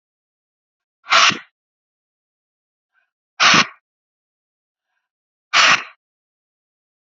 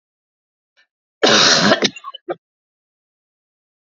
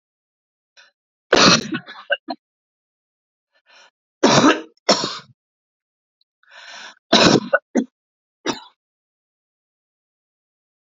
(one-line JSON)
{"exhalation_length": "7.2 s", "exhalation_amplitude": 32694, "exhalation_signal_mean_std_ratio": 0.26, "cough_length": "3.8 s", "cough_amplitude": 32767, "cough_signal_mean_std_ratio": 0.34, "three_cough_length": "10.9 s", "three_cough_amplitude": 32767, "three_cough_signal_mean_std_ratio": 0.29, "survey_phase": "beta (2021-08-13 to 2022-03-07)", "age": "45-64", "gender": "Female", "wearing_mask": "No", "symptom_cough_any": true, "symptom_runny_or_blocked_nose": true, "symptom_sore_throat": true, "symptom_headache": true, "symptom_onset": "3 days", "smoker_status": "Never smoked", "respiratory_condition_asthma": false, "respiratory_condition_other": false, "recruitment_source": "Test and Trace", "submission_delay": "1 day", "covid_test_result": "Positive", "covid_test_method": "RT-qPCR", "covid_ct_value": 25.5, "covid_ct_gene": "N gene"}